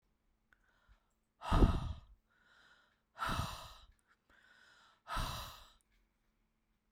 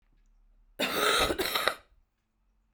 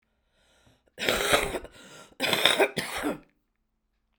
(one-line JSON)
{"exhalation_length": "6.9 s", "exhalation_amplitude": 5239, "exhalation_signal_mean_std_ratio": 0.29, "cough_length": "2.7 s", "cough_amplitude": 12768, "cough_signal_mean_std_ratio": 0.48, "three_cough_length": "4.2 s", "three_cough_amplitude": 32767, "three_cough_signal_mean_std_ratio": 0.44, "survey_phase": "beta (2021-08-13 to 2022-03-07)", "age": "45-64", "gender": "Female", "wearing_mask": "No", "symptom_cough_any": true, "symptom_runny_or_blocked_nose": true, "symptom_sore_throat": true, "symptom_abdominal_pain": true, "symptom_diarrhoea": true, "symptom_fatigue": true, "symptom_headache": true, "symptom_other": true, "symptom_onset": "3 days", "smoker_status": "Current smoker (e-cigarettes or vapes only)", "respiratory_condition_asthma": false, "respiratory_condition_other": false, "recruitment_source": "Test and Trace", "submission_delay": "1 day", "covid_test_result": "Positive", "covid_test_method": "ePCR"}